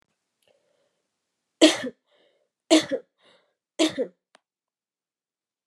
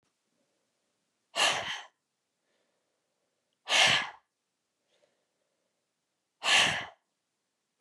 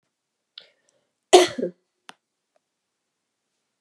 {
  "three_cough_length": "5.7 s",
  "three_cough_amplitude": 29702,
  "three_cough_signal_mean_std_ratio": 0.23,
  "exhalation_length": "7.8 s",
  "exhalation_amplitude": 9546,
  "exhalation_signal_mean_std_ratio": 0.29,
  "cough_length": "3.8 s",
  "cough_amplitude": 32767,
  "cough_signal_mean_std_ratio": 0.17,
  "survey_phase": "beta (2021-08-13 to 2022-03-07)",
  "age": "18-44",
  "gender": "Female",
  "wearing_mask": "No",
  "symptom_headache": true,
  "smoker_status": "Ex-smoker",
  "respiratory_condition_asthma": true,
  "respiratory_condition_other": false,
  "recruitment_source": "REACT",
  "submission_delay": "0 days",
  "covid_test_result": "Negative",
  "covid_test_method": "RT-qPCR",
  "influenza_a_test_result": "Negative",
  "influenza_b_test_result": "Negative"
}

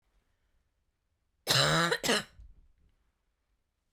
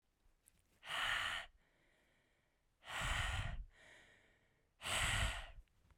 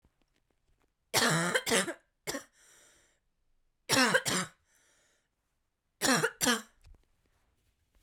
{
  "cough_length": "3.9 s",
  "cough_amplitude": 8079,
  "cough_signal_mean_std_ratio": 0.34,
  "exhalation_length": "6.0 s",
  "exhalation_amplitude": 2049,
  "exhalation_signal_mean_std_ratio": 0.52,
  "three_cough_length": "8.0 s",
  "three_cough_amplitude": 10639,
  "three_cough_signal_mean_std_ratio": 0.37,
  "survey_phase": "beta (2021-08-13 to 2022-03-07)",
  "age": "18-44",
  "gender": "Female",
  "wearing_mask": "No",
  "symptom_cough_any": true,
  "symptom_new_continuous_cough": true,
  "symptom_runny_or_blocked_nose": true,
  "symptom_sore_throat": true,
  "symptom_fatigue": true,
  "symptom_headache": true,
  "symptom_onset": "2 days",
  "smoker_status": "Current smoker (e-cigarettes or vapes only)",
  "respiratory_condition_asthma": false,
  "respiratory_condition_other": false,
  "recruitment_source": "Test and Trace",
  "submission_delay": "1 day",
  "covid_test_result": "Positive",
  "covid_test_method": "RT-qPCR",
  "covid_ct_value": 23.0,
  "covid_ct_gene": "N gene"
}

